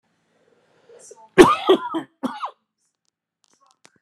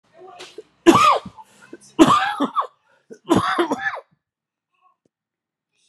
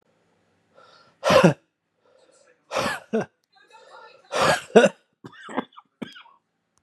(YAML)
cough_length: 4.0 s
cough_amplitude: 32768
cough_signal_mean_std_ratio: 0.26
three_cough_length: 5.9 s
three_cough_amplitude: 32767
three_cough_signal_mean_std_ratio: 0.38
exhalation_length: 6.8 s
exhalation_amplitude: 29652
exhalation_signal_mean_std_ratio: 0.3
survey_phase: beta (2021-08-13 to 2022-03-07)
age: 45-64
gender: Male
wearing_mask: 'Yes'
symptom_cough_any: true
symptom_new_continuous_cough: true
symptom_runny_or_blocked_nose: true
symptom_sore_throat: true
symptom_fatigue: true
symptom_fever_high_temperature: true
symptom_headache: true
symptom_change_to_sense_of_smell_or_taste: true
symptom_loss_of_taste: true
symptom_onset: 4 days
smoker_status: Never smoked
respiratory_condition_asthma: false
respiratory_condition_other: false
recruitment_source: Test and Trace
submission_delay: 2 days
covid_test_result: Positive
covid_test_method: RT-qPCR
covid_ct_value: 23.9
covid_ct_gene: ORF1ab gene
covid_ct_mean: 24.3
covid_viral_load: 11000 copies/ml
covid_viral_load_category: Low viral load (10K-1M copies/ml)